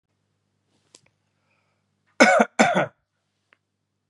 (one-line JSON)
{"cough_length": "4.1 s", "cough_amplitude": 32760, "cough_signal_mean_std_ratio": 0.27, "survey_phase": "beta (2021-08-13 to 2022-03-07)", "age": "45-64", "gender": "Male", "wearing_mask": "No", "symptom_none": true, "smoker_status": "Never smoked", "respiratory_condition_asthma": false, "respiratory_condition_other": false, "recruitment_source": "REACT", "submission_delay": "1 day", "covid_test_result": "Negative", "covid_test_method": "RT-qPCR", "influenza_a_test_result": "Negative", "influenza_b_test_result": "Negative"}